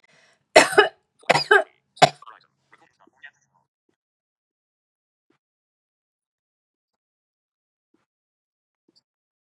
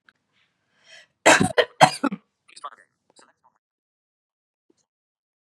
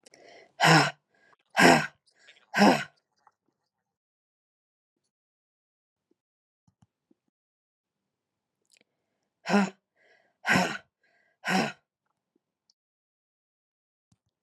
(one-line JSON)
{"three_cough_length": "9.5 s", "three_cough_amplitude": 32768, "three_cough_signal_mean_std_ratio": 0.17, "cough_length": "5.5 s", "cough_amplitude": 32768, "cough_signal_mean_std_ratio": 0.22, "exhalation_length": "14.4 s", "exhalation_amplitude": 20157, "exhalation_signal_mean_std_ratio": 0.24, "survey_phase": "beta (2021-08-13 to 2022-03-07)", "age": "45-64", "gender": "Female", "wearing_mask": "No", "symptom_none": true, "symptom_onset": "9 days", "smoker_status": "Ex-smoker", "respiratory_condition_asthma": false, "respiratory_condition_other": false, "recruitment_source": "REACT", "submission_delay": "5 days", "covid_test_result": "Negative", "covid_test_method": "RT-qPCR", "influenza_a_test_result": "Negative", "influenza_b_test_result": "Negative"}